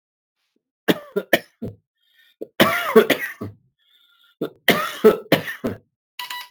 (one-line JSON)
{"three_cough_length": "6.5 s", "three_cough_amplitude": 32385, "three_cough_signal_mean_std_ratio": 0.35, "survey_phase": "alpha (2021-03-01 to 2021-08-12)", "age": "45-64", "gender": "Male", "wearing_mask": "Yes", "symptom_fatigue": true, "symptom_headache": true, "symptom_change_to_sense_of_smell_or_taste": true, "smoker_status": "Never smoked", "respiratory_condition_asthma": true, "respiratory_condition_other": false, "recruitment_source": "Test and Trace", "submission_delay": "2 days", "covid_test_result": "Positive", "covid_test_method": "RT-qPCR", "covid_ct_value": 21.1, "covid_ct_gene": "ORF1ab gene"}